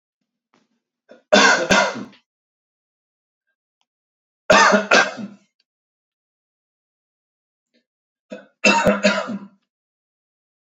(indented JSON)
{
  "three_cough_length": "10.8 s",
  "three_cough_amplitude": 32767,
  "three_cough_signal_mean_std_ratio": 0.32,
  "survey_phase": "beta (2021-08-13 to 2022-03-07)",
  "age": "18-44",
  "gender": "Male",
  "wearing_mask": "No",
  "symptom_none": true,
  "symptom_onset": "13 days",
  "smoker_status": "Never smoked",
  "respiratory_condition_asthma": false,
  "respiratory_condition_other": false,
  "recruitment_source": "REACT",
  "submission_delay": "2 days",
  "covid_test_result": "Negative",
  "covid_test_method": "RT-qPCR",
  "influenza_a_test_result": "Unknown/Void",
  "influenza_b_test_result": "Unknown/Void"
}